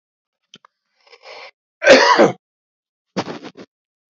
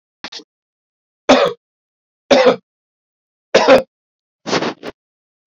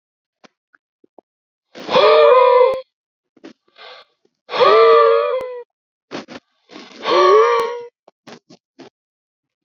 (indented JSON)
{
  "cough_length": "4.1 s",
  "cough_amplitude": 30005,
  "cough_signal_mean_std_ratio": 0.3,
  "three_cough_length": "5.5 s",
  "three_cough_amplitude": 29901,
  "three_cough_signal_mean_std_ratio": 0.33,
  "exhalation_length": "9.6 s",
  "exhalation_amplitude": 29586,
  "exhalation_signal_mean_std_ratio": 0.44,
  "survey_phase": "alpha (2021-03-01 to 2021-08-12)",
  "age": "45-64",
  "gender": "Male",
  "wearing_mask": "No",
  "symptom_cough_any": true,
  "symptom_shortness_of_breath": true,
  "symptom_headache": true,
  "symptom_onset": "6 days",
  "smoker_status": "Ex-smoker",
  "respiratory_condition_asthma": false,
  "respiratory_condition_other": false,
  "recruitment_source": "REACT",
  "submission_delay": "2 days",
  "covid_test_result": "Negative",
  "covid_test_method": "RT-qPCR"
}